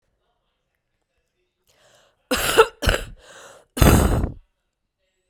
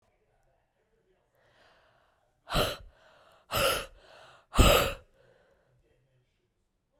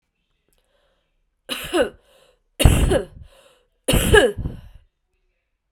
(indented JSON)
{
  "cough_length": "5.3 s",
  "cough_amplitude": 32768,
  "cough_signal_mean_std_ratio": 0.32,
  "exhalation_length": "7.0 s",
  "exhalation_amplitude": 13531,
  "exhalation_signal_mean_std_ratio": 0.27,
  "three_cough_length": "5.7 s",
  "three_cough_amplitude": 32768,
  "three_cough_signal_mean_std_ratio": 0.35,
  "survey_phase": "beta (2021-08-13 to 2022-03-07)",
  "age": "45-64",
  "gender": "Female",
  "wearing_mask": "No",
  "symptom_cough_any": true,
  "symptom_runny_or_blocked_nose": true,
  "symptom_abdominal_pain": true,
  "symptom_fatigue": true,
  "symptom_other": true,
  "symptom_onset": "2 days",
  "smoker_status": "Ex-smoker",
  "respiratory_condition_asthma": true,
  "respiratory_condition_other": false,
  "recruitment_source": "Test and Trace",
  "submission_delay": "1 day",
  "covid_test_result": "Positive",
  "covid_test_method": "RT-qPCR",
  "covid_ct_value": 12.7,
  "covid_ct_gene": "ORF1ab gene",
  "covid_ct_mean": 13.2,
  "covid_viral_load": "46000000 copies/ml",
  "covid_viral_load_category": "High viral load (>1M copies/ml)"
}